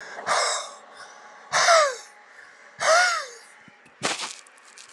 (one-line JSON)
{"exhalation_length": "4.9 s", "exhalation_amplitude": 17979, "exhalation_signal_mean_std_ratio": 0.48, "survey_phase": "alpha (2021-03-01 to 2021-08-12)", "age": "65+", "gender": "Male", "wearing_mask": "No", "symptom_cough_any": true, "symptom_fatigue": true, "smoker_status": "Never smoked", "respiratory_condition_asthma": false, "respiratory_condition_other": false, "recruitment_source": "REACT", "submission_delay": "1 day", "covid_test_result": "Negative", "covid_test_method": "RT-qPCR"}